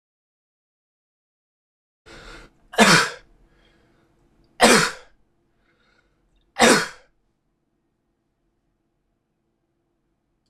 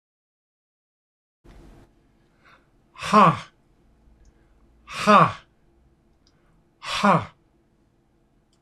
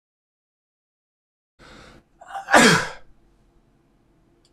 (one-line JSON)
{"three_cough_length": "10.5 s", "three_cough_amplitude": 26028, "three_cough_signal_mean_std_ratio": 0.23, "exhalation_length": "8.6 s", "exhalation_amplitude": 25056, "exhalation_signal_mean_std_ratio": 0.26, "cough_length": "4.5 s", "cough_amplitude": 25735, "cough_signal_mean_std_ratio": 0.24, "survey_phase": "beta (2021-08-13 to 2022-03-07)", "age": "45-64", "gender": "Male", "wearing_mask": "No", "symptom_runny_or_blocked_nose": true, "smoker_status": "Never smoked", "respiratory_condition_asthma": false, "respiratory_condition_other": false, "recruitment_source": "Test and Trace", "submission_delay": "2 days", "covid_test_result": "Positive", "covid_test_method": "RT-qPCR"}